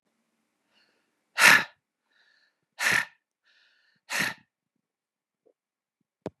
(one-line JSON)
{"exhalation_length": "6.4 s", "exhalation_amplitude": 26355, "exhalation_signal_mean_std_ratio": 0.23, "survey_phase": "beta (2021-08-13 to 2022-03-07)", "age": "45-64", "gender": "Male", "wearing_mask": "No", "symptom_cough_any": true, "symptom_sore_throat": true, "symptom_fatigue": true, "symptom_onset": "3 days", "smoker_status": "Never smoked", "respiratory_condition_asthma": false, "respiratory_condition_other": false, "recruitment_source": "Test and Trace", "submission_delay": "2 days", "covid_test_result": "Positive", "covid_test_method": "RT-qPCR", "covid_ct_value": 16.9, "covid_ct_gene": "ORF1ab gene", "covid_ct_mean": 17.2, "covid_viral_load": "2300000 copies/ml", "covid_viral_load_category": "High viral load (>1M copies/ml)"}